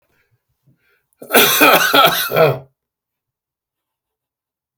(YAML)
cough_length: 4.8 s
cough_amplitude: 32768
cough_signal_mean_std_ratio: 0.4
survey_phase: beta (2021-08-13 to 2022-03-07)
age: 65+
gender: Male
wearing_mask: 'No'
symptom_none: true
smoker_status: Never smoked
respiratory_condition_asthma: false
respiratory_condition_other: false
recruitment_source: REACT
submission_delay: 2 days
covid_test_result: Negative
covid_test_method: RT-qPCR
influenza_a_test_result: Negative
influenza_b_test_result: Negative